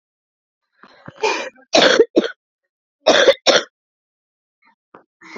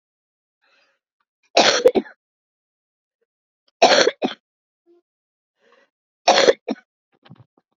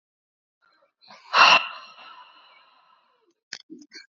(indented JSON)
{
  "cough_length": "5.4 s",
  "cough_amplitude": 32768,
  "cough_signal_mean_std_ratio": 0.34,
  "three_cough_length": "7.8 s",
  "three_cough_amplitude": 31502,
  "three_cough_signal_mean_std_ratio": 0.27,
  "exhalation_length": "4.2 s",
  "exhalation_amplitude": 23059,
  "exhalation_signal_mean_std_ratio": 0.24,
  "survey_phase": "beta (2021-08-13 to 2022-03-07)",
  "age": "18-44",
  "gender": "Female",
  "wearing_mask": "No",
  "symptom_cough_any": true,
  "symptom_runny_or_blocked_nose": true,
  "symptom_fatigue": true,
  "smoker_status": "Current smoker (11 or more cigarettes per day)",
  "respiratory_condition_asthma": true,
  "respiratory_condition_other": false,
  "recruitment_source": "Test and Trace",
  "submission_delay": "-1 day",
  "covid_test_result": "Positive",
  "covid_test_method": "LFT"
}